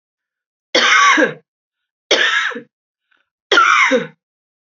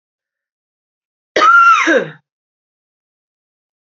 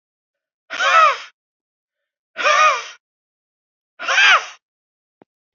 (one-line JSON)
{"three_cough_length": "4.6 s", "three_cough_amplitude": 32767, "three_cough_signal_mean_std_ratio": 0.49, "cough_length": "3.8 s", "cough_amplitude": 28422, "cough_signal_mean_std_ratio": 0.37, "exhalation_length": "5.5 s", "exhalation_amplitude": 27793, "exhalation_signal_mean_std_ratio": 0.38, "survey_phase": "beta (2021-08-13 to 2022-03-07)", "age": "45-64", "gender": "Female", "wearing_mask": "No", "symptom_cough_any": true, "symptom_runny_or_blocked_nose": true, "symptom_fatigue": true, "symptom_other": true, "symptom_onset": "5 days", "smoker_status": "Never smoked", "respiratory_condition_asthma": false, "respiratory_condition_other": false, "recruitment_source": "Test and Trace", "submission_delay": "2 days", "covid_test_result": "Positive", "covid_test_method": "RT-qPCR", "covid_ct_value": 29.4, "covid_ct_gene": "N gene"}